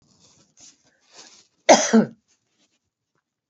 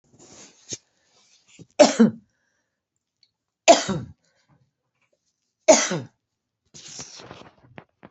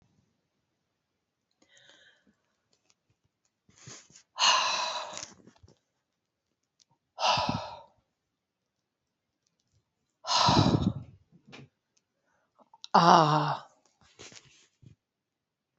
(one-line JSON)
{"cough_length": "3.5 s", "cough_amplitude": 27992, "cough_signal_mean_std_ratio": 0.23, "three_cough_length": "8.1 s", "three_cough_amplitude": 27892, "three_cough_signal_mean_std_ratio": 0.23, "exhalation_length": "15.8 s", "exhalation_amplitude": 19349, "exhalation_signal_mean_std_ratio": 0.29, "survey_phase": "beta (2021-08-13 to 2022-03-07)", "age": "45-64", "gender": "Female", "wearing_mask": "No", "symptom_fatigue": true, "symptom_headache": true, "symptom_change_to_sense_of_smell_or_taste": true, "symptom_onset": "4 days", "smoker_status": "Never smoked", "respiratory_condition_asthma": false, "respiratory_condition_other": false, "recruitment_source": "Test and Trace", "submission_delay": "2 days", "covid_test_result": "Positive", "covid_test_method": "RT-qPCR", "covid_ct_value": 22.5, "covid_ct_gene": "ORF1ab gene", "covid_ct_mean": 23.2, "covid_viral_load": "25000 copies/ml", "covid_viral_load_category": "Low viral load (10K-1M copies/ml)"}